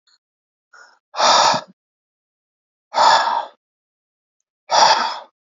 {"exhalation_length": "5.5 s", "exhalation_amplitude": 29472, "exhalation_signal_mean_std_ratio": 0.4, "survey_phase": "beta (2021-08-13 to 2022-03-07)", "age": "18-44", "gender": "Male", "wearing_mask": "No", "symptom_none": true, "smoker_status": "Ex-smoker", "respiratory_condition_asthma": false, "respiratory_condition_other": false, "recruitment_source": "REACT", "submission_delay": "2 days", "covid_test_result": "Negative", "covid_test_method": "RT-qPCR"}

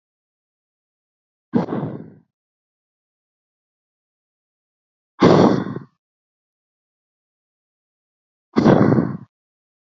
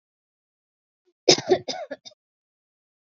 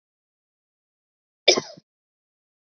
{"exhalation_length": "10.0 s", "exhalation_amplitude": 30977, "exhalation_signal_mean_std_ratio": 0.27, "three_cough_length": "3.1 s", "three_cough_amplitude": 31046, "three_cough_signal_mean_std_ratio": 0.22, "cough_length": "2.7 s", "cough_amplitude": 32767, "cough_signal_mean_std_ratio": 0.15, "survey_phase": "beta (2021-08-13 to 2022-03-07)", "age": "18-44", "gender": "Female", "wearing_mask": "No", "symptom_fatigue": true, "symptom_onset": "13 days", "smoker_status": "Never smoked", "respiratory_condition_asthma": false, "respiratory_condition_other": false, "recruitment_source": "REACT", "submission_delay": "4 days", "covid_test_result": "Negative", "covid_test_method": "RT-qPCR"}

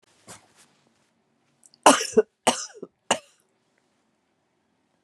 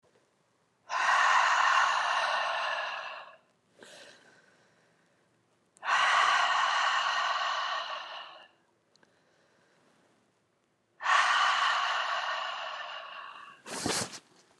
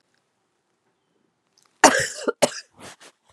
{"three_cough_length": "5.0 s", "three_cough_amplitude": 31475, "three_cough_signal_mean_std_ratio": 0.21, "exhalation_length": "14.6 s", "exhalation_amplitude": 7705, "exhalation_signal_mean_std_ratio": 0.6, "cough_length": "3.3 s", "cough_amplitude": 32768, "cough_signal_mean_std_ratio": 0.24, "survey_phase": "beta (2021-08-13 to 2022-03-07)", "age": "45-64", "gender": "Female", "wearing_mask": "No", "symptom_cough_any": true, "symptom_shortness_of_breath": true, "symptom_sore_throat": true, "symptom_abdominal_pain": true, "symptom_fatigue": true, "symptom_headache": true, "symptom_onset": "4 days", "smoker_status": "Ex-smoker", "respiratory_condition_asthma": false, "respiratory_condition_other": false, "recruitment_source": "Test and Trace", "submission_delay": "1 day", "covid_test_result": "Positive", "covid_test_method": "RT-qPCR", "covid_ct_value": 22.2, "covid_ct_gene": "ORF1ab gene"}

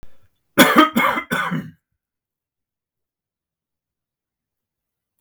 {"cough_length": "5.2 s", "cough_amplitude": 32768, "cough_signal_mean_std_ratio": 0.3, "survey_phase": "beta (2021-08-13 to 2022-03-07)", "age": "45-64", "gender": "Male", "wearing_mask": "No", "symptom_none": true, "smoker_status": "Never smoked", "respiratory_condition_asthma": false, "respiratory_condition_other": false, "recruitment_source": "REACT", "submission_delay": "3 days", "covid_test_result": "Negative", "covid_test_method": "RT-qPCR", "influenza_a_test_result": "Negative", "influenza_b_test_result": "Negative"}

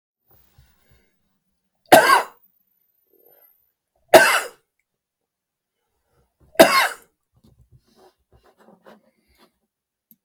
{"three_cough_length": "10.2 s", "three_cough_amplitude": 32768, "three_cough_signal_mean_std_ratio": 0.22, "survey_phase": "beta (2021-08-13 to 2022-03-07)", "age": "65+", "gender": "Male", "wearing_mask": "No", "symptom_none": true, "smoker_status": "Ex-smoker", "respiratory_condition_asthma": false, "respiratory_condition_other": false, "recruitment_source": "REACT", "submission_delay": "2 days", "covid_test_result": "Negative", "covid_test_method": "RT-qPCR", "influenza_a_test_result": "Negative", "influenza_b_test_result": "Negative"}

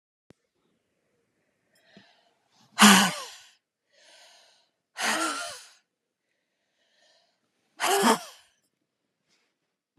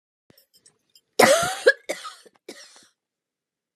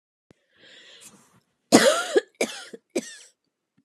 {"exhalation_length": "10.0 s", "exhalation_amplitude": 24574, "exhalation_signal_mean_std_ratio": 0.25, "three_cough_length": "3.8 s", "three_cough_amplitude": 29378, "three_cough_signal_mean_std_ratio": 0.27, "cough_length": "3.8 s", "cough_amplitude": 29337, "cough_signal_mean_std_ratio": 0.29, "survey_phase": "beta (2021-08-13 to 2022-03-07)", "age": "45-64", "gender": "Female", "wearing_mask": "No", "symptom_cough_any": true, "symptom_new_continuous_cough": true, "symptom_runny_or_blocked_nose": true, "symptom_shortness_of_breath": true, "symptom_abdominal_pain": true, "symptom_headache": true, "symptom_change_to_sense_of_smell_or_taste": true, "symptom_loss_of_taste": true, "smoker_status": "Ex-smoker", "respiratory_condition_asthma": false, "respiratory_condition_other": false, "recruitment_source": "Test and Trace", "submission_delay": "1 day", "covid_test_result": "Positive", "covid_test_method": "RT-qPCR", "covid_ct_value": 20.8, "covid_ct_gene": "ORF1ab gene", "covid_ct_mean": 21.6, "covid_viral_load": "79000 copies/ml", "covid_viral_load_category": "Low viral load (10K-1M copies/ml)"}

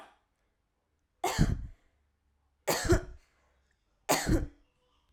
{"three_cough_length": "5.1 s", "three_cough_amplitude": 8849, "three_cough_signal_mean_std_ratio": 0.36, "survey_phase": "alpha (2021-03-01 to 2021-08-12)", "age": "18-44", "gender": "Female", "wearing_mask": "No", "symptom_none": true, "smoker_status": "Never smoked", "respiratory_condition_asthma": false, "respiratory_condition_other": false, "recruitment_source": "REACT", "submission_delay": "3 days", "covid_test_result": "Negative", "covid_test_method": "RT-qPCR"}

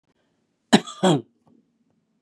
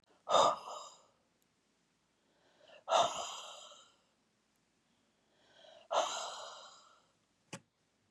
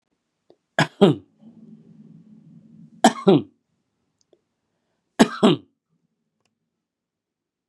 {"cough_length": "2.2 s", "cough_amplitude": 30707, "cough_signal_mean_std_ratio": 0.26, "exhalation_length": "8.1 s", "exhalation_amplitude": 5455, "exhalation_signal_mean_std_ratio": 0.31, "three_cough_length": "7.7 s", "three_cough_amplitude": 32767, "three_cough_signal_mean_std_ratio": 0.23, "survey_phase": "beta (2021-08-13 to 2022-03-07)", "age": "45-64", "gender": "Male", "wearing_mask": "Yes", "symptom_none": true, "smoker_status": "Ex-smoker", "respiratory_condition_asthma": false, "respiratory_condition_other": false, "recruitment_source": "REACT", "submission_delay": "3 days", "covid_test_result": "Negative", "covid_test_method": "RT-qPCR", "influenza_a_test_result": "Negative", "influenza_b_test_result": "Negative"}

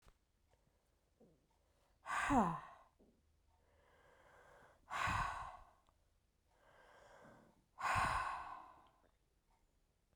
{"exhalation_length": "10.2 s", "exhalation_amplitude": 2265, "exhalation_signal_mean_std_ratio": 0.36, "survey_phase": "beta (2021-08-13 to 2022-03-07)", "age": "18-44", "gender": "Female", "wearing_mask": "No", "symptom_cough_any": true, "symptom_runny_or_blocked_nose": true, "symptom_sore_throat": true, "symptom_fatigue": true, "symptom_headache": true, "symptom_change_to_sense_of_smell_or_taste": true, "symptom_onset": "3 days", "smoker_status": "Never smoked", "respiratory_condition_asthma": false, "respiratory_condition_other": false, "recruitment_source": "Test and Trace", "submission_delay": "1 day", "covid_test_result": "Positive", "covid_test_method": "RT-qPCR", "covid_ct_value": 18.6, "covid_ct_gene": "ORF1ab gene"}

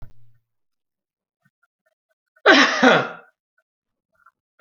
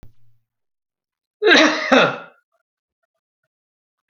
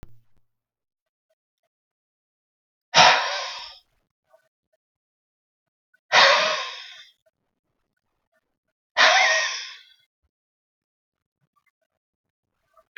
{"three_cough_length": "4.6 s", "three_cough_amplitude": 28937, "three_cough_signal_mean_std_ratio": 0.28, "cough_length": "4.1 s", "cough_amplitude": 32768, "cough_signal_mean_std_ratio": 0.32, "exhalation_length": "13.0 s", "exhalation_amplitude": 31967, "exhalation_signal_mean_std_ratio": 0.27, "survey_phase": "alpha (2021-03-01 to 2021-08-12)", "age": "65+", "gender": "Male", "wearing_mask": "No", "symptom_none": true, "smoker_status": "Ex-smoker", "respiratory_condition_asthma": false, "respiratory_condition_other": false, "recruitment_source": "REACT", "submission_delay": "6 days", "covid_test_result": "Negative", "covid_test_method": "RT-qPCR"}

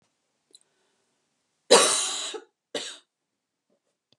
{"cough_length": "4.2 s", "cough_amplitude": 28636, "cough_signal_mean_std_ratio": 0.27, "survey_phase": "beta (2021-08-13 to 2022-03-07)", "age": "45-64", "gender": "Female", "wearing_mask": "No", "symptom_none": true, "symptom_onset": "12 days", "smoker_status": "Ex-smoker", "respiratory_condition_asthma": false, "respiratory_condition_other": false, "recruitment_source": "REACT", "submission_delay": "1 day", "covid_test_result": "Negative", "covid_test_method": "RT-qPCR", "influenza_a_test_result": "Negative", "influenza_b_test_result": "Negative"}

